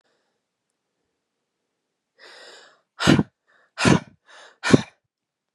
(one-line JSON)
{"exhalation_length": "5.5 s", "exhalation_amplitude": 32522, "exhalation_signal_mean_std_ratio": 0.23, "survey_phase": "beta (2021-08-13 to 2022-03-07)", "age": "18-44", "gender": "Female", "wearing_mask": "No", "symptom_cough_any": true, "symptom_new_continuous_cough": true, "symptom_runny_or_blocked_nose": true, "symptom_fatigue": true, "symptom_loss_of_taste": true, "symptom_onset": "5 days", "smoker_status": "Ex-smoker", "respiratory_condition_asthma": false, "respiratory_condition_other": false, "recruitment_source": "Test and Trace", "submission_delay": "1 day", "covid_test_result": "Positive", "covid_test_method": "ePCR"}